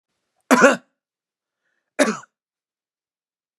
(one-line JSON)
{"cough_length": "3.6 s", "cough_amplitude": 32532, "cough_signal_mean_std_ratio": 0.24, "survey_phase": "beta (2021-08-13 to 2022-03-07)", "age": "45-64", "gender": "Male", "wearing_mask": "No", "symptom_none": true, "smoker_status": "Never smoked", "respiratory_condition_asthma": false, "respiratory_condition_other": false, "recruitment_source": "REACT", "submission_delay": "2 days", "covid_test_result": "Negative", "covid_test_method": "RT-qPCR"}